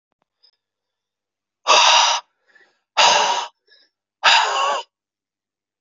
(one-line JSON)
{"exhalation_length": "5.8 s", "exhalation_amplitude": 29985, "exhalation_signal_mean_std_ratio": 0.42, "survey_phase": "beta (2021-08-13 to 2022-03-07)", "age": "18-44", "gender": "Male", "wearing_mask": "No", "symptom_change_to_sense_of_smell_or_taste": true, "smoker_status": "Current smoker (e-cigarettes or vapes only)", "respiratory_condition_asthma": false, "respiratory_condition_other": false, "recruitment_source": "Test and Trace", "submission_delay": "1 day", "covid_test_result": "Positive", "covid_test_method": "RT-qPCR", "covid_ct_value": 20.7, "covid_ct_gene": "ORF1ab gene", "covid_ct_mean": 21.3, "covid_viral_load": "100000 copies/ml", "covid_viral_load_category": "Low viral load (10K-1M copies/ml)"}